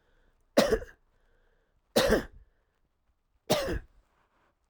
three_cough_length: 4.7 s
three_cough_amplitude: 16315
three_cough_signal_mean_std_ratio: 0.32
survey_phase: alpha (2021-03-01 to 2021-08-12)
age: 45-64
gender: Male
wearing_mask: 'No'
symptom_none: true
smoker_status: Never smoked
respiratory_condition_asthma: false
respiratory_condition_other: false
recruitment_source: REACT
submission_delay: 1 day
covid_test_result: Negative
covid_test_method: RT-qPCR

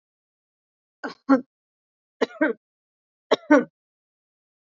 three_cough_length: 4.6 s
three_cough_amplitude: 25496
three_cough_signal_mean_std_ratio: 0.24
survey_phase: beta (2021-08-13 to 2022-03-07)
age: 18-44
gender: Female
wearing_mask: 'No'
symptom_none: true
smoker_status: Never smoked
respiratory_condition_asthma: false
respiratory_condition_other: false
recruitment_source: REACT
submission_delay: 1 day
covid_test_result: Negative
covid_test_method: RT-qPCR
influenza_a_test_result: Unknown/Void
influenza_b_test_result: Unknown/Void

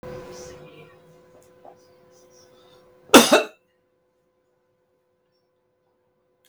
cough_length: 6.5 s
cough_amplitude: 32768
cough_signal_mean_std_ratio: 0.18
survey_phase: beta (2021-08-13 to 2022-03-07)
age: 65+
gender: Male
wearing_mask: 'No'
symptom_none: true
smoker_status: Ex-smoker
respiratory_condition_asthma: false
respiratory_condition_other: false
recruitment_source: REACT
submission_delay: 1 day
covid_test_result: Negative
covid_test_method: RT-qPCR
influenza_a_test_result: Negative
influenza_b_test_result: Negative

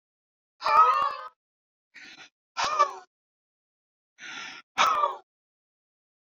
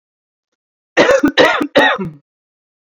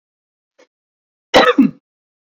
exhalation_length: 6.2 s
exhalation_amplitude: 14147
exhalation_signal_mean_std_ratio: 0.36
three_cough_length: 3.0 s
three_cough_amplitude: 29019
three_cough_signal_mean_std_ratio: 0.45
cough_length: 2.2 s
cough_amplitude: 29471
cough_signal_mean_std_ratio: 0.3
survey_phase: beta (2021-08-13 to 2022-03-07)
age: 18-44
gender: Female
wearing_mask: 'No'
symptom_sore_throat: true
symptom_onset: 6 days
smoker_status: Ex-smoker
respiratory_condition_asthma: true
respiratory_condition_other: false
recruitment_source: REACT
submission_delay: 0 days
covid_test_result: Negative
covid_test_method: RT-qPCR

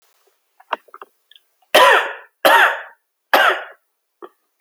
three_cough_length: 4.6 s
three_cough_amplitude: 32682
three_cough_signal_mean_std_ratio: 0.37
survey_phase: alpha (2021-03-01 to 2021-08-12)
age: 18-44
gender: Male
wearing_mask: 'No'
symptom_none: true
smoker_status: Never smoked
respiratory_condition_asthma: false
respiratory_condition_other: false
recruitment_source: REACT
submission_delay: 1 day
covid_test_result: Negative
covid_test_method: RT-qPCR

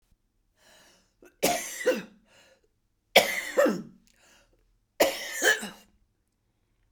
three_cough_length: 6.9 s
three_cough_amplitude: 28359
three_cough_signal_mean_std_ratio: 0.34
survey_phase: beta (2021-08-13 to 2022-03-07)
age: 45-64
gender: Female
wearing_mask: 'No'
symptom_cough_any: true
symptom_runny_or_blocked_nose: true
symptom_shortness_of_breath: true
symptom_sore_throat: true
symptom_fatigue: true
symptom_other: true
smoker_status: Never smoked
respiratory_condition_asthma: true
respiratory_condition_other: false
recruitment_source: Test and Trace
submission_delay: 1 day
covid_test_result: Positive
covid_test_method: ePCR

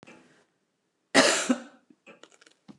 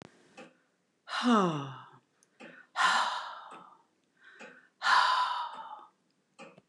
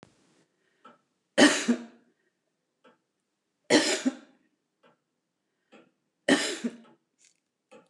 cough_length: 2.8 s
cough_amplitude: 20652
cough_signal_mean_std_ratio: 0.3
exhalation_length: 6.7 s
exhalation_amplitude: 7759
exhalation_signal_mean_std_ratio: 0.44
three_cough_length: 7.9 s
three_cough_amplitude: 17185
three_cough_signal_mean_std_ratio: 0.27
survey_phase: beta (2021-08-13 to 2022-03-07)
age: 65+
gender: Female
wearing_mask: 'No'
symptom_none: true
smoker_status: Ex-smoker
respiratory_condition_asthma: false
respiratory_condition_other: false
recruitment_source: REACT
submission_delay: 2 days
covid_test_result: Negative
covid_test_method: RT-qPCR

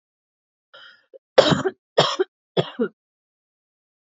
three_cough_length: 4.1 s
three_cough_amplitude: 32768
three_cough_signal_mean_std_ratio: 0.28
survey_phase: beta (2021-08-13 to 2022-03-07)
age: 18-44
gender: Female
wearing_mask: 'No'
symptom_none: true
smoker_status: Ex-smoker
respiratory_condition_asthma: false
respiratory_condition_other: false
recruitment_source: REACT
submission_delay: 1 day
covid_test_result: Negative
covid_test_method: RT-qPCR
influenza_a_test_result: Negative
influenza_b_test_result: Negative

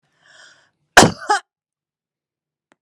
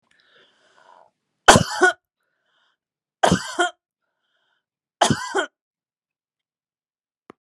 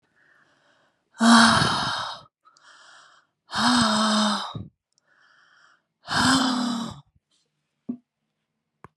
cough_length: 2.8 s
cough_amplitude: 32768
cough_signal_mean_std_ratio: 0.21
three_cough_length: 7.4 s
three_cough_amplitude: 32768
three_cough_signal_mean_std_ratio: 0.24
exhalation_length: 9.0 s
exhalation_amplitude: 25050
exhalation_signal_mean_std_ratio: 0.44
survey_phase: beta (2021-08-13 to 2022-03-07)
age: 65+
gender: Female
wearing_mask: 'No'
symptom_none: true
smoker_status: Never smoked
respiratory_condition_asthma: false
respiratory_condition_other: false
recruitment_source: REACT
submission_delay: 2 days
covid_test_result: Negative
covid_test_method: RT-qPCR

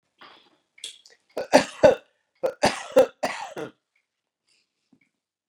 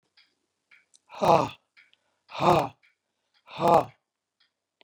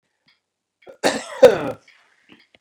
three_cough_length: 5.5 s
three_cough_amplitude: 29159
three_cough_signal_mean_std_ratio: 0.27
exhalation_length: 4.8 s
exhalation_amplitude: 18558
exhalation_signal_mean_std_ratio: 0.29
cough_length: 2.6 s
cough_amplitude: 32768
cough_signal_mean_std_ratio: 0.25
survey_phase: beta (2021-08-13 to 2022-03-07)
age: 45-64
gender: Male
wearing_mask: 'No'
symptom_none: true
smoker_status: Ex-smoker
respiratory_condition_asthma: false
respiratory_condition_other: false
recruitment_source: REACT
submission_delay: 9 days
covid_test_result: Negative
covid_test_method: RT-qPCR
influenza_a_test_result: Negative
influenza_b_test_result: Negative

